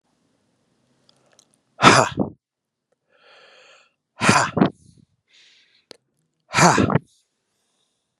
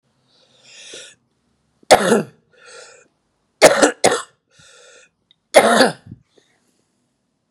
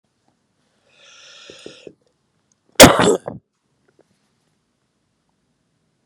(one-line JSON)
{"exhalation_length": "8.2 s", "exhalation_amplitude": 32768, "exhalation_signal_mean_std_ratio": 0.28, "three_cough_length": "7.5 s", "three_cough_amplitude": 32768, "three_cough_signal_mean_std_ratio": 0.29, "cough_length": "6.1 s", "cough_amplitude": 32768, "cough_signal_mean_std_ratio": 0.18, "survey_phase": "beta (2021-08-13 to 2022-03-07)", "age": "45-64", "gender": "Male", "wearing_mask": "No", "symptom_new_continuous_cough": true, "symptom_runny_or_blocked_nose": true, "symptom_shortness_of_breath": true, "symptom_sore_throat": true, "symptom_diarrhoea": true, "symptom_fatigue": true, "symptom_fever_high_temperature": true, "symptom_headache": true, "symptom_change_to_sense_of_smell_or_taste": true, "symptom_loss_of_taste": true, "symptom_onset": "4 days", "smoker_status": "Never smoked", "respiratory_condition_asthma": false, "respiratory_condition_other": false, "recruitment_source": "Test and Trace", "submission_delay": "2 days", "covid_test_result": "Positive", "covid_test_method": "RT-qPCR", "covid_ct_value": 21.9, "covid_ct_gene": "ORF1ab gene"}